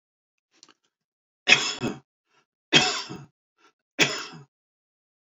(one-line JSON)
{"three_cough_length": "5.3 s", "three_cough_amplitude": 28683, "three_cough_signal_mean_std_ratio": 0.28, "survey_phase": "beta (2021-08-13 to 2022-03-07)", "age": "65+", "gender": "Male", "wearing_mask": "No", "symptom_none": true, "smoker_status": "Ex-smoker", "respiratory_condition_asthma": false, "respiratory_condition_other": false, "recruitment_source": "REACT", "submission_delay": "2 days", "covid_test_result": "Negative", "covid_test_method": "RT-qPCR"}